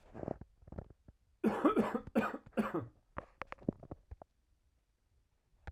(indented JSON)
{
  "cough_length": "5.7 s",
  "cough_amplitude": 4513,
  "cough_signal_mean_std_ratio": 0.37,
  "survey_phase": "alpha (2021-03-01 to 2021-08-12)",
  "age": "18-44",
  "gender": "Male",
  "wearing_mask": "No",
  "symptom_cough_any": true,
  "symptom_fatigue": true,
  "smoker_status": "Ex-smoker",
  "respiratory_condition_asthma": false,
  "respiratory_condition_other": false,
  "recruitment_source": "Test and Trace",
  "submission_delay": "2 days",
  "covid_test_result": "Positive",
  "covid_test_method": "RT-qPCR",
  "covid_ct_value": 24.3,
  "covid_ct_gene": "N gene"
}